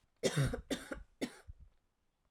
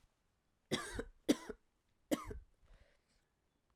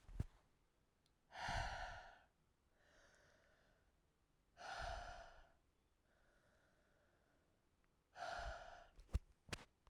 {"cough_length": "2.3 s", "cough_amplitude": 3352, "cough_signal_mean_std_ratio": 0.43, "three_cough_length": "3.8 s", "three_cough_amplitude": 3854, "three_cough_signal_mean_std_ratio": 0.27, "exhalation_length": "9.9 s", "exhalation_amplitude": 1126, "exhalation_signal_mean_std_ratio": 0.4, "survey_phase": "alpha (2021-03-01 to 2021-08-12)", "age": "18-44", "gender": "Female", "wearing_mask": "No", "symptom_cough_any": true, "symptom_new_continuous_cough": true, "symptom_fatigue": true, "symptom_fever_high_temperature": true, "symptom_headache": true, "symptom_change_to_sense_of_smell_or_taste": true, "smoker_status": "Ex-smoker", "respiratory_condition_asthma": true, "respiratory_condition_other": false, "recruitment_source": "Test and Trace", "submission_delay": "1 day", "covid_test_result": "Positive", "covid_test_method": "RT-qPCR", "covid_ct_value": 19.5, "covid_ct_gene": "N gene"}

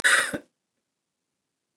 {"cough_length": "1.8 s", "cough_amplitude": 15901, "cough_signal_mean_std_ratio": 0.31, "survey_phase": "beta (2021-08-13 to 2022-03-07)", "age": "45-64", "gender": "Female", "wearing_mask": "No", "symptom_cough_any": true, "symptom_runny_or_blocked_nose": true, "symptom_sore_throat": true, "symptom_fatigue": true, "symptom_headache": true, "symptom_change_to_sense_of_smell_or_taste": true, "smoker_status": "Ex-smoker", "respiratory_condition_asthma": false, "respiratory_condition_other": false, "recruitment_source": "Test and Trace", "submission_delay": "1 day", "covid_test_result": "Positive", "covid_test_method": "LFT"}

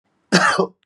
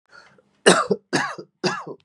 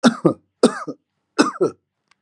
{"cough_length": "0.9 s", "cough_amplitude": 30355, "cough_signal_mean_std_ratio": 0.52, "three_cough_length": "2.0 s", "three_cough_amplitude": 32167, "three_cough_signal_mean_std_ratio": 0.4, "exhalation_length": "2.2 s", "exhalation_amplitude": 32627, "exhalation_signal_mean_std_ratio": 0.36, "survey_phase": "beta (2021-08-13 to 2022-03-07)", "age": "45-64", "gender": "Male", "wearing_mask": "No", "symptom_cough_any": true, "symptom_runny_or_blocked_nose": true, "symptom_shortness_of_breath": true, "symptom_sore_throat": true, "symptom_diarrhoea": true, "symptom_fatigue": true, "smoker_status": "Never smoked", "respiratory_condition_asthma": true, "respiratory_condition_other": false, "recruitment_source": "Test and Trace", "submission_delay": "1 day", "covid_test_method": "RT-qPCR", "covid_ct_value": 32.9, "covid_ct_gene": "ORF1ab gene", "covid_ct_mean": 33.0, "covid_viral_load": "15 copies/ml", "covid_viral_load_category": "Minimal viral load (< 10K copies/ml)"}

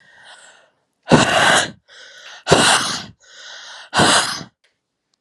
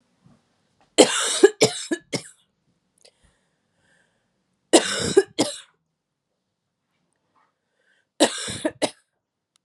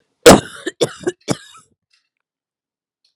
{"exhalation_length": "5.2 s", "exhalation_amplitude": 32768, "exhalation_signal_mean_std_ratio": 0.46, "three_cough_length": "9.6 s", "three_cough_amplitude": 32767, "three_cough_signal_mean_std_ratio": 0.27, "cough_length": "3.2 s", "cough_amplitude": 32768, "cough_signal_mean_std_ratio": 0.23, "survey_phase": "alpha (2021-03-01 to 2021-08-12)", "age": "18-44", "gender": "Female", "wearing_mask": "No", "symptom_cough_any": true, "symptom_shortness_of_breath": true, "symptom_fatigue": true, "symptom_fever_high_temperature": true, "symptom_headache": true, "symptom_change_to_sense_of_smell_or_taste": true, "symptom_loss_of_taste": true, "symptom_onset": "3 days", "smoker_status": "Never smoked", "respiratory_condition_asthma": false, "respiratory_condition_other": false, "recruitment_source": "Test and Trace", "submission_delay": "1 day", "covid_test_result": "Positive", "covid_test_method": "RT-qPCR", "covid_ct_value": 15.2, "covid_ct_gene": "ORF1ab gene", "covid_ct_mean": 15.4, "covid_viral_load": "8800000 copies/ml", "covid_viral_load_category": "High viral load (>1M copies/ml)"}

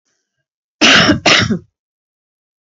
{"cough_length": "2.7 s", "cough_amplitude": 32768, "cough_signal_mean_std_ratio": 0.42, "survey_phase": "beta (2021-08-13 to 2022-03-07)", "age": "45-64", "gender": "Female", "wearing_mask": "No", "symptom_cough_any": true, "symptom_runny_or_blocked_nose": true, "symptom_shortness_of_breath": true, "symptom_sore_throat": true, "smoker_status": "Never smoked", "respiratory_condition_asthma": true, "respiratory_condition_other": false, "recruitment_source": "Test and Trace", "submission_delay": "1 day", "covid_test_result": "Positive", "covid_test_method": "RT-qPCR", "covid_ct_value": 27.3, "covid_ct_gene": "ORF1ab gene"}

